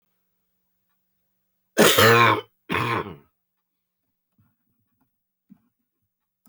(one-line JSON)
{"cough_length": "6.5 s", "cough_amplitude": 28214, "cough_signal_mean_std_ratio": 0.29, "survey_phase": "beta (2021-08-13 to 2022-03-07)", "age": "65+", "gender": "Male", "wearing_mask": "No", "symptom_cough_any": true, "symptom_runny_or_blocked_nose": true, "symptom_sore_throat": true, "symptom_onset": "8 days", "smoker_status": "Never smoked", "respiratory_condition_asthma": false, "respiratory_condition_other": false, "recruitment_source": "REACT", "submission_delay": "1 day", "covid_test_result": "Positive", "covid_test_method": "RT-qPCR", "covid_ct_value": 19.8, "covid_ct_gene": "E gene", "influenza_a_test_result": "Negative", "influenza_b_test_result": "Negative"}